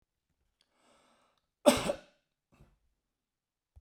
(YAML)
cough_length: 3.8 s
cough_amplitude: 14400
cough_signal_mean_std_ratio: 0.17
survey_phase: beta (2021-08-13 to 2022-03-07)
age: 45-64
gender: Male
wearing_mask: 'No'
symptom_none: true
smoker_status: Never smoked
respiratory_condition_asthma: false
respiratory_condition_other: false
recruitment_source: REACT
submission_delay: 1 day
covid_test_result: Negative
covid_test_method: RT-qPCR